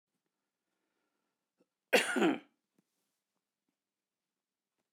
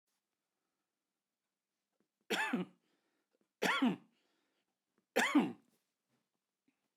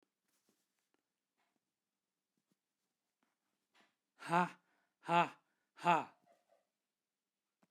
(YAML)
cough_length: 4.9 s
cough_amplitude: 7462
cough_signal_mean_std_ratio: 0.22
three_cough_length: 7.0 s
three_cough_amplitude: 4779
three_cough_signal_mean_std_ratio: 0.29
exhalation_length: 7.7 s
exhalation_amplitude: 4359
exhalation_signal_mean_std_ratio: 0.19
survey_phase: beta (2021-08-13 to 2022-03-07)
age: 65+
gender: Male
wearing_mask: 'No'
symptom_cough_any: true
symptom_runny_or_blocked_nose: true
symptom_onset: 12 days
smoker_status: Ex-smoker
respiratory_condition_asthma: false
respiratory_condition_other: false
recruitment_source: REACT
submission_delay: 2 days
covid_test_result: Negative
covid_test_method: RT-qPCR
influenza_a_test_result: Negative
influenza_b_test_result: Negative